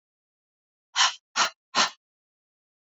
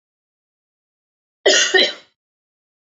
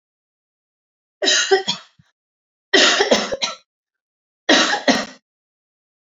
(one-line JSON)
{"exhalation_length": "2.8 s", "exhalation_amplitude": 14090, "exhalation_signal_mean_std_ratio": 0.3, "cough_length": "2.9 s", "cough_amplitude": 29467, "cough_signal_mean_std_ratio": 0.3, "three_cough_length": "6.1 s", "three_cough_amplitude": 30170, "three_cough_signal_mean_std_ratio": 0.4, "survey_phase": "beta (2021-08-13 to 2022-03-07)", "age": "18-44", "gender": "Female", "wearing_mask": "No", "symptom_sore_throat": true, "symptom_onset": "7 days", "smoker_status": "Never smoked", "respiratory_condition_asthma": false, "respiratory_condition_other": false, "recruitment_source": "REACT", "submission_delay": "0 days", "covid_test_result": "Negative", "covid_test_method": "RT-qPCR", "influenza_a_test_result": "Negative", "influenza_b_test_result": "Negative"}